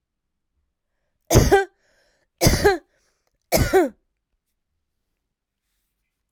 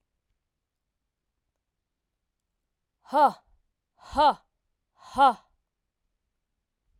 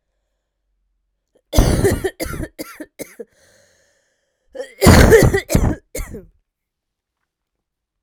{"three_cough_length": "6.3 s", "three_cough_amplitude": 29483, "three_cough_signal_mean_std_ratio": 0.31, "exhalation_length": "7.0 s", "exhalation_amplitude": 13151, "exhalation_signal_mean_std_ratio": 0.22, "cough_length": "8.0 s", "cough_amplitude": 32768, "cough_signal_mean_std_ratio": 0.33, "survey_phase": "alpha (2021-03-01 to 2021-08-12)", "age": "18-44", "gender": "Female", "wearing_mask": "No", "symptom_cough_any": true, "symptom_new_continuous_cough": true, "symptom_fatigue": true, "symptom_fever_high_temperature": true, "symptom_change_to_sense_of_smell_or_taste": true, "symptom_onset": "4 days", "smoker_status": "Never smoked", "respiratory_condition_asthma": false, "respiratory_condition_other": false, "recruitment_source": "Test and Trace", "submission_delay": "1 day", "covid_test_result": "Positive", "covid_test_method": "RT-qPCR", "covid_ct_value": 16.4, "covid_ct_gene": "ORF1ab gene", "covid_ct_mean": 17.7, "covid_viral_load": "1600000 copies/ml", "covid_viral_load_category": "High viral load (>1M copies/ml)"}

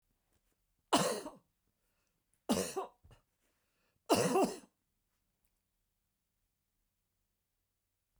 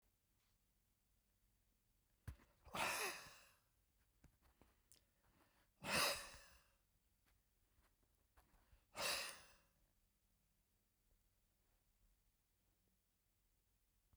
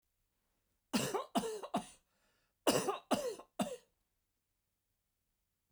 {"three_cough_length": "8.2 s", "three_cough_amplitude": 5512, "three_cough_signal_mean_std_ratio": 0.27, "exhalation_length": "14.2 s", "exhalation_amplitude": 1257, "exhalation_signal_mean_std_ratio": 0.27, "cough_length": "5.7 s", "cough_amplitude": 5144, "cough_signal_mean_std_ratio": 0.37, "survey_phase": "beta (2021-08-13 to 2022-03-07)", "age": "65+", "gender": "Male", "wearing_mask": "No", "symptom_none": true, "smoker_status": "Never smoked", "respiratory_condition_asthma": false, "respiratory_condition_other": false, "recruitment_source": "REACT", "submission_delay": "1 day", "covid_test_result": "Negative", "covid_test_method": "RT-qPCR", "influenza_a_test_result": "Negative", "influenza_b_test_result": "Negative"}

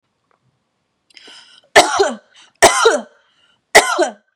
{"three_cough_length": "4.4 s", "three_cough_amplitude": 32768, "three_cough_signal_mean_std_ratio": 0.36, "survey_phase": "beta (2021-08-13 to 2022-03-07)", "age": "18-44", "gender": "Female", "wearing_mask": "No", "symptom_none": true, "smoker_status": "Never smoked", "respiratory_condition_asthma": false, "respiratory_condition_other": false, "recruitment_source": "REACT", "submission_delay": "1 day", "covid_test_result": "Negative", "covid_test_method": "RT-qPCR", "influenza_a_test_result": "Negative", "influenza_b_test_result": "Negative"}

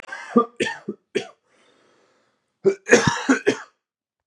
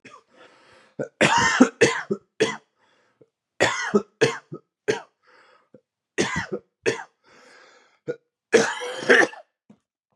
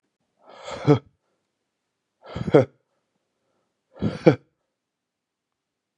{"cough_length": "4.3 s", "cough_amplitude": 32768, "cough_signal_mean_std_ratio": 0.35, "three_cough_length": "10.2 s", "three_cough_amplitude": 30487, "three_cough_signal_mean_std_ratio": 0.37, "exhalation_length": "6.0 s", "exhalation_amplitude": 31969, "exhalation_signal_mean_std_ratio": 0.21, "survey_phase": "beta (2021-08-13 to 2022-03-07)", "age": "18-44", "gender": "Male", "wearing_mask": "No", "symptom_cough_any": true, "symptom_new_continuous_cough": true, "symptom_runny_or_blocked_nose": true, "symptom_fatigue": true, "symptom_fever_high_temperature": true, "symptom_headache": true, "symptom_other": true, "smoker_status": "Current smoker (1 to 10 cigarettes per day)", "respiratory_condition_asthma": false, "respiratory_condition_other": false, "recruitment_source": "Test and Trace", "submission_delay": "2 days", "covid_test_result": "Positive", "covid_test_method": "RT-qPCR", "covid_ct_value": 13.0, "covid_ct_gene": "S gene", "covid_ct_mean": 13.6, "covid_viral_load": "35000000 copies/ml", "covid_viral_load_category": "High viral load (>1M copies/ml)"}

